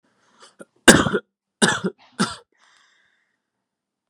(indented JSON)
{
  "three_cough_length": "4.1 s",
  "three_cough_amplitude": 32768,
  "three_cough_signal_mean_std_ratio": 0.26,
  "survey_phase": "beta (2021-08-13 to 2022-03-07)",
  "age": "18-44",
  "gender": "Male",
  "wearing_mask": "No",
  "symptom_none": true,
  "smoker_status": "Never smoked",
  "respiratory_condition_asthma": false,
  "respiratory_condition_other": false,
  "recruitment_source": "REACT",
  "submission_delay": "1 day",
  "covid_test_result": "Negative",
  "covid_test_method": "RT-qPCR"
}